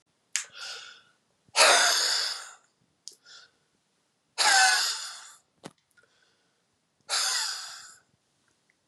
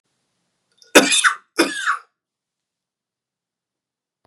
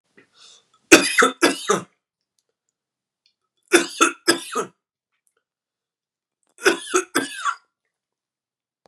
exhalation_length: 8.9 s
exhalation_amplitude: 20871
exhalation_signal_mean_std_ratio: 0.39
cough_length: 4.3 s
cough_amplitude: 32768
cough_signal_mean_std_ratio: 0.28
three_cough_length: 8.9 s
three_cough_amplitude: 32768
three_cough_signal_mean_std_ratio: 0.29
survey_phase: beta (2021-08-13 to 2022-03-07)
age: 45-64
gender: Male
wearing_mask: 'No'
symptom_cough_any: true
symptom_runny_or_blocked_nose: true
symptom_shortness_of_breath: true
symptom_fatigue: true
symptom_headache: true
symptom_onset: 2 days
smoker_status: Ex-smoker
respiratory_condition_asthma: false
respiratory_condition_other: false
recruitment_source: Test and Trace
submission_delay: 2 days
covid_test_result: Positive
covid_test_method: RT-qPCR
covid_ct_value: 19.7
covid_ct_gene: ORF1ab gene
covid_ct_mean: 19.9
covid_viral_load: 290000 copies/ml
covid_viral_load_category: Low viral load (10K-1M copies/ml)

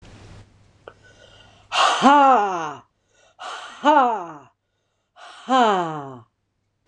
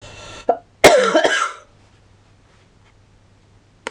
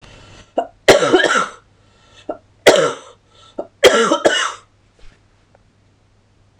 exhalation_length: 6.9 s
exhalation_amplitude: 26028
exhalation_signal_mean_std_ratio: 0.43
cough_length: 3.9 s
cough_amplitude: 26028
cough_signal_mean_std_ratio: 0.35
three_cough_length: 6.6 s
three_cough_amplitude: 26028
three_cough_signal_mean_std_ratio: 0.39
survey_phase: beta (2021-08-13 to 2022-03-07)
age: 45-64
gender: Female
wearing_mask: 'No'
symptom_cough_any: true
symptom_fatigue: true
symptom_fever_high_temperature: true
symptom_other: true
smoker_status: Never smoked
respiratory_condition_asthma: false
respiratory_condition_other: true
recruitment_source: REACT
submission_delay: 1 day
covid_test_result: Positive
covid_test_method: RT-qPCR
covid_ct_value: 16.8
covid_ct_gene: E gene
influenza_a_test_result: Negative
influenza_b_test_result: Negative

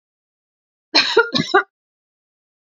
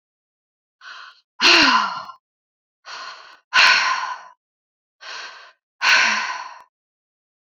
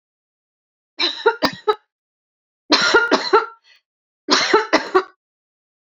cough_length: 2.6 s
cough_amplitude: 30031
cough_signal_mean_std_ratio: 0.32
exhalation_length: 7.5 s
exhalation_amplitude: 30033
exhalation_signal_mean_std_ratio: 0.4
three_cough_length: 5.9 s
three_cough_amplitude: 30771
three_cough_signal_mean_std_ratio: 0.4
survey_phase: beta (2021-08-13 to 2022-03-07)
age: 45-64
gender: Female
wearing_mask: 'No'
symptom_none: true
smoker_status: Never smoked
respiratory_condition_asthma: false
respiratory_condition_other: false
recruitment_source: REACT
submission_delay: 1 day
covid_test_result: Negative
covid_test_method: RT-qPCR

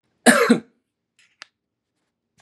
cough_length: 2.4 s
cough_amplitude: 32768
cough_signal_mean_std_ratio: 0.27
survey_phase: beta (2021-08-13 to 2022-03-07)
age: 45-64
gender: Male
wearing_mask: 'No'
symptom_none: true
smoker_status: Never smoked
respiratory_condition_asthma: false
respiratory_condition_other: false
recruitment_source: REACT
submission_delay: 4 days
covid_test_result: Negative
covid_test_method: RT-qPCR
influenza_a_test_result: Negative
influenza_b_test_result: Negative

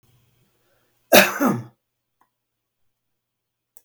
cough_length: 3.8 s
cough_amplitude: 32768
cough_signal_mean_std_ratio: 0.23
survey_phase: beta (2021-08-13 to 2022-03-07)
age: 65+
gender: Male
wearing_mask: 'No'
symptom_none: true
smoker_status: Ex-smoker
respiratory_condition_asthma: false
respiratory_condition_other: false
recruitment_source: REACT
submission_delay: 1 day
covid_test_result: Negative
covid_test_method: RT-qPCR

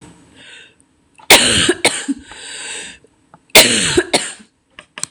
cough_length: 5.1 s
cough_amplitude: 26028
cough_signal_mean_std_ratio: 0.42
survey_phase: beta (2021-08-13 to 2022-03-07)
age: 18-44
gender: Female
wearing_mask: 'No'
symptom_cough_any: true
symptom_new_continuous_cough: true
smoker_status: Never smoked
respiratory_condition_asthma: false
respiratory_condition_other: false
recruitment_source: REACT
submission_delay: 3 days
covid_test_result: Negative
covid_test_method: RT-qPCR
influenza_a_test_result: Negative
influenza_b_test_result: Negative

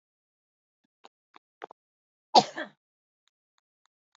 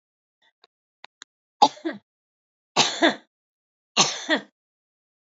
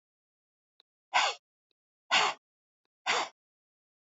cough_length: 4.2 s
cough_amplitude: 17774
cough_signal_mean_std_ratio: 0.12
three_cough_length: 5.3 s
three_cough_amplitude: 27204
three_cough_signal_mean_std_ratio: 0.27
exhalation_length: 4.1 s
exhalation_amplitude: 8373
exhalation_signal_mean_std_ratio: 0.3
survey_phase: alpha (2021-03-01 to 2021-08-12)
age: 45-64
gender: Female
wearing_mask: 'No'
symptom_none: true
smoker_status: Current smoker (1 to 10 cigarettes per day)
respiratory_condition_asthma: false
respiratory_condition_other: false
recruitment_source: REACT
submission_delay: 5 days
covid_test_result: Negative
covid_test_method: RT-qPCR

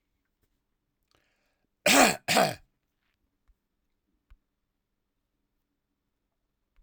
cough_length: 6.8 s
cough_amplitude: 16646
cough_signal_mean_std_ratio: 0.21
survey_phase: alpha (2021-03-01 to 2021-08-12)
age: 45-64
gender: Male
wearing_mask: 'No'
symptom_loss_of_taste: true
symptom_onset: 3 days
smoker_status: Never smoked
respiratory_condition_asthma: false
respiratory_condition_other: false
recruitment_source: Test and Trace
submission_delay: 1 day
covid_test_result: Positive
covid_test_method: RT-qPCR
covid_ct_value: 16.4
covid_ct_gene: ORF1ab gene
covid_ct_mean: 16.8
covid_viral_load: 3100000 copies/ml
covid_viral_load_category: High viral load (>1M copies/ml)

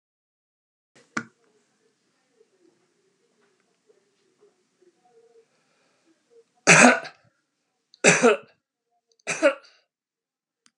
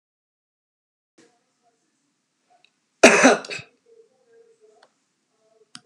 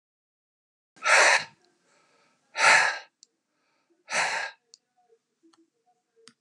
three_cough_length: 10.8 s
three_cough_amplitude: 32236
three_cough_signal_mean_std_ratio: 0.21
cough_length: 5.9 s
cough_amplitude: 32768
cough_signal_mean_std_ratio: 0.19
exhalation_length: 6.4 s
exhalation_amplitude: 16140
exhalation_signal_mean_std_ratio: 0.32
survey_phase: alpha (2021-03-01 to 2021-08-12)
age: 65+
gender: Male
wearing_mask: 'No'
symptom_none: true
smoker_status: Ex-smoker
respiratory_condition_asthma: false
respiratory_condition_other: false
recruitment_source: REACT
submission_delay: 3 days
covid_test_result: Negative
covid_test_method: RT-qPCR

